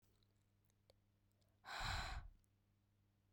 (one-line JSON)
{"exhalation_length": "3.3 s", "exhalation_amplitude": 701, "exhalation_signal_mean_std_ratio": 0.4, "survey_phase": "beta (2021-08-13 to 2022-03-07)", "age": "18-44", "gender": "Female", "wearing_mask": "No", "symptom_cough_any": true, "symptom_new_continuous_cough": true, "symptom_runny_or_blocked_nose": true, "symptom_diarrhoea": true, "symptom_fever_high_temperature": true, "symptom_headache": true, "symptom_onset": "4 days", "smoker_status": "Never smoked", "respiratory_condition_asthma": false, "respiratory_condition_other": false, "recruitment_source": "Test and Trace", "submission_delay": "2 days", "covid_test_result": "Positive", "covid_test_method": "RT-qPCR"}